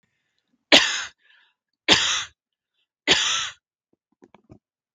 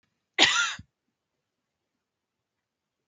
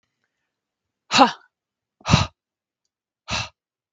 {
  "three_cough_length": "4.9 s",
  "three_cough_amplitude": 32768,
  "three_cough_signal_mean_std_ratio": 0.32,
  "cough_length": "3.1 s",
  "cough_amplitude": 25070,
  "cough_signal_mean_std_ratio": 0.25,
  "exhalation_length": "3.9 s",
  "exhalation_amplitude": 32768,
  "exhalation_signal_mean_std_ratio": 0.25,
  "survey_phase": "beta (2021-08-13 to 2022-03-07)",
  "age": "18-44",
  "gender": "Female",
  "wearing_mask": "No",
  "symptom_sore_throat": true,
  "smoker_status": "Never smoked",
  "respiratory_condition_asthma": false,
  "respiratory_condition_other": false,
  "recruitment_source": "REACT",
  "submission_delay": "0 days",
  "covid_test_result": "Negative",
  "covid_test_method": "RT-qPCR"
}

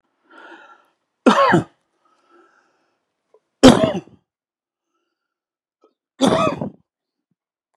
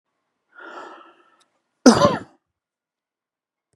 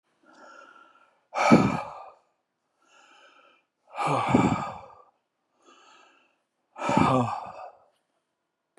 {
  "three_cough_length": "7.8 s",
  "three_cough_amplitude": 32768,
  "three_cough_signal_mean_std_ratio": 0.27,
  "cough_length": "3.8 s",
  "cough_amplitude": 32767,
  "cough_signal_mean_std_ratio": 0.22,
  "exhalation_length": "8.8 s",
  "exhalation_amplitude": 22962,
  "exhalation_signal_mean_std_ratio": 0.36,
  "survey_phase": "beta (2021-08-13 to 2022-03-07)",
  "age": "65+",
  "gender": "Male",
  "wearing_mask": "No",
  "symptom_none": true,
  "smoker_status": "Never smoked",
  "respiratory_condition_asthma": false,
  "respiratory_condition_other": true,
  "recruitment_source": "REACT",
  "submission_delay": "2 days",
  "covid_test_result": "Negative",
  "covid_test_method": "RT-qPCR",
  "influenza_a_test_result": "Negative",
  "influenza_b_test_result": "Negative"
}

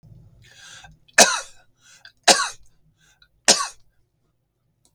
{
  "three_cough_length": "4.9 s",
  "three_cough_amplitude": 32768,
  "three_cough_signal_mean_std_ratio": 0.25,
  "survey_phase": "beta (2021-08-13 to 2022-03-07)",
  "age": "45-64",
  "gender": "Male",
  "wearing_mask": "No",
  "symptom_none": true,
  "smoker_status": "Never smoked",
  "respiratory_condition_asthma": false,
  "respiratory_condition_other": false,
  "recruitment_source": "REACT",
  "submission_delay": "2 days",
  "covid_test_result": "Negative",
  "covid_test_method": "RT-qPCR",
  "influenza_a_test_result": "Negative",
  "influenza_b_test_result": "Negative"
}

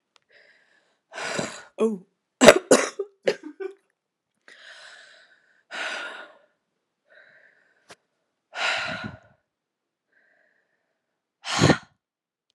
{
  "exhalation_length": "12.5 s",
  "exhalation_amplitude": 32768,
  "exhalation_signal_mean_std_ratio": 0.24,
  "survey_phase": "alpha (2021-03-01 to 2021-08-12)",
  "age": "18-44",
  "gender": "Female",
  "wearing_mask": "No",
  "symptom_cough_any": true,
  "symptom_new_continuous_cough": true,
  "symptom_shortness_of_breath": true,
  "symptom_headache": true,
  "symptom_change_to_sense_of_smell_or_taste": true,
  "symptom_loss_of_taste": true,
  "symptom_onset": "4 days",
  "smoker_status": "Never smoked",
  "respiratory_condition_asthma": false,
  "respiratory_condition_other": false,
  "recruitment_source": "Test and Trace",
  "submission_delay": "2 days",
  "covid_test_result": "Positive",
  "covid_test_method": "RT-qPCR"
}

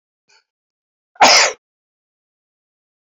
{
  "cough_length": "3.2 s",
  "cough_amplitude": 32503,
  "cough_signal_mean_std_ratio": 0.25,
  "survey_phase": "beta (2021-08-13 to 2022-03-07)",
  "age": "65+",
  "gender": "Male",
  "wearing_mask": "No",
  "symptom_cough_any": true,
  "symptom_onset": "12 days",
  "smoker_status": "Never smoked",
  "respiratory_condition_asthma": true,
  "respiratory_condition_other": true,
  "recruitment_source": "REACT",
  "submission_delay": "7 days",
  "covid_test_result": "Negative",
  "covid_test_method": "RT-qPCR"
}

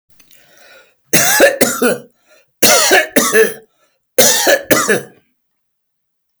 {
  "three_cough_length": "6.4 s",
  "three_cough_amplitude": 32768,
  "three_cough_signal_mean_std_ratio": 0.51,
  "survey_phase": "beta (2021-08-13 to 2022-03-07)",
  "age": "65+",
  "gender": "Male",
  "wearing_mask": "No",
  "symptom_none": true,
  "smoker_status": "Never smoked",
  "respiratory_condition_asthma": false,
  "respiratory_condition_other": false,
  "recruitment_source": "REACT",
  "submission_delay": "1 day",
  "covid_test_result": "Negative",
  "covid_test_method": "RT-qPCR"
}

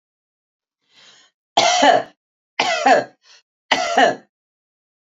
{
  "three_cough_length": "5.1 s",
  "three_cough_amplitude": 31495,
  "three_cough_signal_mean_std_ratio": 0.39,
  "survey_phase": "beta (2021-08-13 to 2022-03-07)",
  "age": "45-64",
  "gender": "Female",
  "wearing_mask": "No",
  "symptom_none": true,
  "smoker_status": "Never smoked",
  "respiratory_condition_asthma": false,
  "respiratory_condition_other": false,
  "recruitment_source": "REACT",
  "submission_delay": "2 days",
  "covid_test_result": "Negative",
  "covid_test_method": "RT-qPCR",
  "influenza_a_test_result": "Negative",
  "influenza_b_test_result": "Negative"
}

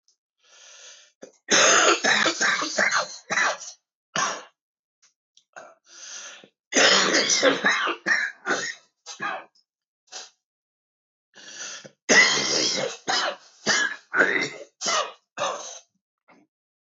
{
  "three_cough_length": "17.0 s",
  "three_cough_amplitude": 19440,
  "three_cough_signal_mean_std_ratio": 0.5,
  "survey_phase": "beta (2021-08-13 to 2022-03-07)",
  "age": "45-64",
  "gender": "Male",
  "wearing_mask": "No",
  "symptom_cough_any": true,
  "symptom_runny_or_blocked_nose": true,
  "symptom_shortness_of_breath": true,
  "symptom_sore_throat": true,
  "symptom_fatigue": true,
  "symptom_fever_high_temperature": true,
  "symptom_headache": true,
  "symptom_change_to_sense_of_smell_or_taste": true,
  "symptom_loss_of_taste": true,
  "symptom_onset": "5 days",
  "smoker_status": "Never smoked",
  "respiratory_condition_asthma": false,
  "respiratory_condition_other": false,
  "recruitment_source": "REACT",
  "submission_delay": "1 day",
  "covid_test_result": "Negative",
  "covid_test_method": "RT-qPCR",
  "influenza_a_test_result": "Negative",
  "influenza_b_test_result": "Negative"
}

